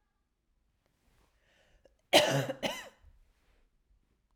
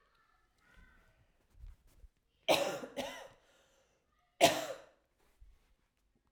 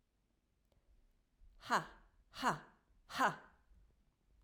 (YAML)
cough_length: 4.4 s
cough_amplitude: 10742
cough_signal_mean_std_ratio: 0.25
three_cough_length: 6.3 s
three_cough_amplitude: 8554
three_cough_signal_mean_std_ratio: 0.26
exhalation_length: 4.4 s
exhalation_amplitude: 3073
exhalation_signal_mean_std_ratio: 0.28
survey_phase: beta (2021-08-13 to 2022-03-07)
age: 18-44
gender: Female
wearing_mask: 'No'
symptom_cough_any: true
symptom_sore_throat: true
symptom_onset: 4 days
smoker_status: Never smoked
respiratory_condition_asthma: false
respiratory_condition_other: false
recruitment_source: Test and Trace
submission_delay: 2 days
covid_test_result: Positive
covid_test_method: RT-qPCR
covid_ct_value: 25.0
covid_ct_gene: N gene
covid_ct_mean: 25.2
covid_viral_load: 5400 copies/ml
covid_viral_load_category: Minimal viral load (< 10K copies/ml)